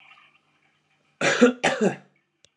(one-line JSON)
{"cough_length": "2.6 s", "cough_amplitude": 24367, "cough_signal_mean_std_ratio": 0.36, "survey_phase": "beta (2021-08-13 to 2022-03-07)", "age": "45-64", "gender": "Male", "wearing_mask": "No", "symptom_cough_any": true, "symptom_runny_or_blocked_nose": true, "symptom_sore_throat": true, "symptom_fatigue": true, "symptom_headache": true, "symptom_change_to_sense_of_smell_or_taste": true, "symptom_onset": "2 days", "smoker_status": "Never smoked", "respiratory_condition_asthma": false, "respiratory_condition_other": false, "recruitment_source": "Test and Trace", "submission_delay": "1 day", "covid_test_result": "Positive", "covid_test_method": "RT-qPCR", "covid_ct_value": 19.9, "covid_ct_gene": "ORF1ab gene", "covid_ct_mean": 20.8, "covid_viral_load": "150000 copies/ml", "covid_viral_load_category": "Low viral load (10K-1M copies/ml)"}